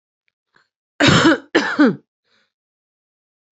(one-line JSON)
{"cough_length": "3.6 s", "cough_amplitude": 31054, "cough_signal_mean_std_ratio": 0.36, "survey_phase": "beta (2021-08-13 to 2022-03-07)", "age": "18-44", "gender": "Female", "wearing_mask": "No", "symptom_none": true, "smoker_status": "Current smoker (11 or more cigarettes per day)", "respiratory_condition_asthma": true, "respiratory_condition_other": false, "recruitment_source": "REACT", "submission_delay": "2 days", "covid_test_result": "Negative", "covid_test_method": "RT-qPCR", "influenza_a_test_result": "Negative", "influenza_b_test_result": "Negative"}